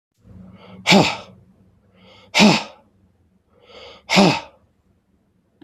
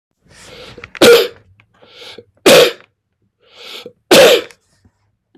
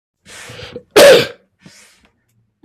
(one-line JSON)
{"exhalation_length": "5.6 s", "exhalation_amplitude": 32767, "exhalation_signal_mean_std_ratio": 0.32, "three_cough_length": "5.4 s", "three_cough_amplitude": 32768, "three_cough_signal_mean_std_ratio": 0.36, "cough_length": "2.6 s", "cough_amplitude": 32768, "cough_signal_mean_std_ratio": 0.33, "survey_phase": "beta (2021-08-13 to 2022-03-07)", "age": "65+", "gender": "Male", "wearing_mask": "No", "symptom_cough_any": true, "symptom_new_continuous_cough": true, "symptom_runny_or_blocked_nose": true, "symptom_sore_throat": true, "symptom_fatigue": true, "symptom_other": true, "symptom_onset": "4 days", "smoker_status": "Never smoked", "respiratory_condition_asthma": false, "respiratory_condition_other": false, "recruitment_source": "Test and Trace", "submission_delay": "2 days", "covid_test_result": "Positive", "covid_test_method": "RT-qPCR", "covid_ct_value": 19.1, "covid_ct_gene": "N gene", "covid_ct_mean": 19.2, "covid_viral_load": "520000 copies/ml", "covid_viral_load_category": "Low viral load (10K-1M copies/ml)"}